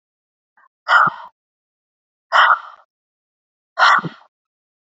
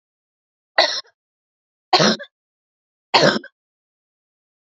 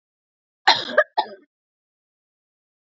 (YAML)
exhalation_length: 4.9 s
exhalation_amplitude: 28900
exhalation_signal_mean_std_ratio: 0.32
three_cough_length: 4.8 s
three_cough_amplitude: 32021
three_cough_signal_mean_std_ratio: 0.28
cough_length: 2.8 s
cough_amplitude: 28496
cough_signal_mean_std_ratio: 0.24
survey_phase: beta (2021-08-13 to 2022-03-07)
age: 18-44
gender: Female
wearing_mask: 'No'
symptom_fatigue: true
smoker_status: Never smoked
respiratory_condition_asthma: true
respiratory_condition_other: false
recruitment_source: REACT
submission_delay: 2 days
covid_test_result: Negative
covid_test_method: RT-qPCR